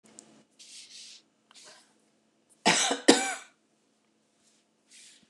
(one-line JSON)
{"cough_length": "5.3 s", "cough_amplitude": 24779, "cough_signal_mean_std_ratio": 0.25, "survey_phase": "beta (2021-08-13 to 2022-03-07)", "age": "45-64", "gender": "Female", "wearing_mask": "No", "symptom_none": true, "smoker_status": "Never smoked", "respiratory_condition_asthma": false, "respiratory_condition_other": false, "recruitment_source": "REACT", "submission_delay": "0 days", "covid_test_result": "Negative", "covid_test_method": "RT-qPCR", "influenza_a_test_result": "Negative", "influenza_b_test_result": "Negative"}